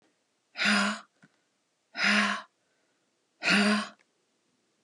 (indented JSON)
{
  "exhalation_length": "4.8 s",
  "exhalation_amplitude": 9067,
  "exhalation_signal_mean_std_ratio": 0.42,
  "survey_phase": "alpha (2021-03-01 to 2021-08-12)",
  "age": "45-64",
  "gender": "Female",
  "wearing_mask": "No",
  "symptom_none": true,
  "smoker_status": "Ex-smoker",
  "respiratory_condition_asthma": true,
  "respiratory_condition_other": false,
  "recruitment_source": "REACT",
  "submission_delay": "1 day",
  "covid_test_result": "Negative",
  "covid_test_method": "RT-qPCR"
}